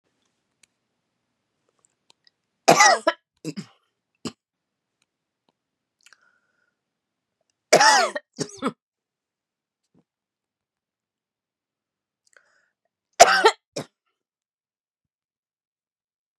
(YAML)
three_cough_length: 16.4 s
three_cough_amplitude: 32768
three_cough_signal_mean_std_ratio: 0.2
survey_phase: beta (2021-08-13 to 2022-03-07)
age: 45-64
gender: Female
wearing_mask: 'No'
symptom_cough_any: true
symptom_onset: 4 days
smoker_status: Never smoked
respiratory_condition_asthma: false
respiratory_condition_other: false
recruitment_source: Test and Trace
submission_delay: 1 day
covid_test_result: Positive
covid_test_method: ePCR